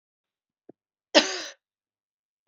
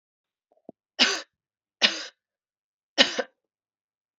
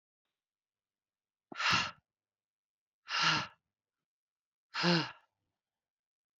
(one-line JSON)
{"cough_length": "2.5 s", "cough_amplitude": 25256, "cough_signal_mean_std_ratio": 0.19, "three_cough_length": "4.2 s", "three_cough_amplitude": 27387, "three_cough_signal_mean_std_ratio": 0.25, "exhalation_length": "6.4 s", "exhalation_amplitude": 5506, "exhalation_signal_mean_std_ratio": 0.31, "survey_phase": "beta (2021-08-13 to 2022-03-07)", "age": "45-64", "gender": "Female", "wearing_mask": "No", "symptom_cough_any": true, "symptom_runny_or_blocked_nose": true, "symptom_fatigue": true, "symptom_headache": true, "symptom_other": true, "symptom_onset": "5 days", "smoker_status": "Never smoked", "respiratory_condition_asthma": false, "respiratory_condition_other": false, "recruitment_source": "Test and Trace", "submission_delay": "3 days", "covid_test_result": "Positive", "covid_test_method": "ePCR"}